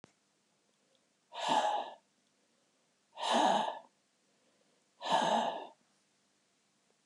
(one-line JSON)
{"exhalation_length": "7.1 s", "exhalation_amplitude": 4592, "exhalation_signal_mean_std_ratio": 0.4, "survey_phase": "alpha (2021-03-01 to 2021-08-12)", "age": "65+", "gender": "Male", "wearing_mask": "No", "symptom_none": true, "smoker_status": "Never smoked", "respiratory_condition_asthma": false, "respiratory_condition_other": false, "recruitment_source": "REACT", "submission_delay": "2 days", "covid_test_result": "Negative", "covid_test_method": "RT-qPCR"}